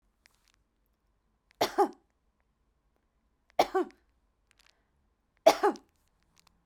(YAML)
three_cough_length: 6.7 s
three_cough_amplitude: 16407
three_cough_signal_mean_std_ratio: 0.21
survey_phase: beta (2021-08-13 to 2022-03-07)
age: 45-64
gender: Female
wearing_mask: 'No'
symptom_none: true
smoker_status: Never smoked
respiratory_condition_asthma: false
respiratory_condition_other: false
recruitment_source: REACT
submission_delay: 1 day
covid_test_result: Negative
covid_test_method: RT-qPCR